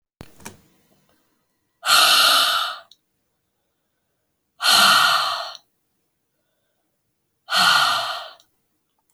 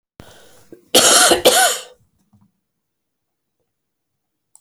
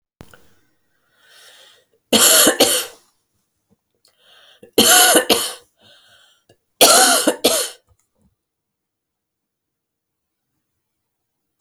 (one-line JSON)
{"exhalation_length": "9.1 s", "exhalation_amplitude": 26960, "exhalation_signal_mean_std_ratio": 0.42, "cough_length": "4.6 s", "cough_amplitude": 32768, "cough_signal_mean_std_ratio": 0.34, "three_cough_length": "11.6 s", "three_cough_amplitude": 32768, "three_cough_signal_mean_std_ratio": 0.34, "survey_phase": "alpha (2021-03-01 to 2021-08-12)", "age": "45-64", "gender": "Female", "wearing_mask": "No", "symptom_cough_any": true, "symptom_new_continuous_cough": true, "symptom_fatigue": true, "smoker_status": "Ex-smoker", "respiratory_condition_asthma": false, "respiratory_condition_other": false, "recruitment_source": "Test and Trace", "submission_delay": "2 days", "covid_test_result": "Positive", "covid_test_method": "RT-qPCR", "covid_ct_value": 26.1, "covid_ct_gene": "ORF1ab gene", "covid_ct_mean": 26.7, "covid_viral_load": "1700 copies/ml", "covid_viral_load_category": "Minimal viral load (< 10K copies/ml)"}